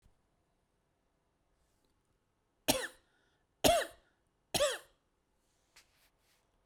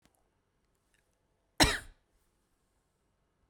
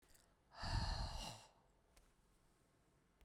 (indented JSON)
{
  "three_cough_length": "6.7 s",
  "three_cough_amplitude": 8509,
  "three_cough_signal_mean_std_ratio": 0.23,
  "cough_length": "3.5 s",
  "cough_amplitude": 12648,
  "cough_signal_mean_std_ratio": 0.17,
  "exhalation_length": "3.2 s",
  "exhalation_amplitude": 1060,
  "exhalation_signal_mean_std_ratio": 0.44,
  "survey_phase": "beta (2021-08-13 to 2022-03-07)",
  "age": "45-64",
  "gender": "Female",
  "wearing_mask": "No",
  "symptom_none": true,
  "smoker_status": "Ex-smoker",
  "respiratory_condition_asthma": false,
  "respiratory_condition_other": false,
  "recruitment_source": "REACT",
  "submission_delay": "8 days",
  "covid_test_result": "Negative",
  "covid_test_method": "RT-qPCR"
}